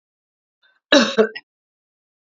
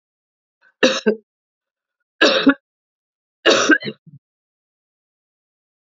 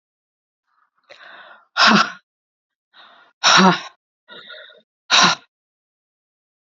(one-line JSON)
{"cough_length": "2.4 s", "cough_amplitude": 29298, "cough_signal_mean_std_ratio": 0.27, "three_cough_length": "5.9 s", "three_cough_amplitude": 30055, "three_cough_signal_mean_std_ratio": 0.3, "exhalation_length": "6.7 s", "exhalation_amplitude": 30854, "exhalation_signal_mean_std_ratio": 0.31, "survey_phase": "beta (2021-08-13 to 2022-03-07)", "age": "45-64", "gender": "Female", "wearing_mask": "No", "symptom_runny_or_blocked_nose": true, "symptom_sore_throat": true, "symptom_fatigue": true, "symptom_onset": "2 days", "smoker_status": "Never smoked", "respiratory_condition_asthma": false, "respiratory_condition_other": false, "recruitment_source": "Test and Trace", "submission_delay": "2 days", "covid_test_result": "Positive", "covid_test_method": "RT-qPCR", "covid_ct_value": 26.9, "covid_ct_gene": "N gene"}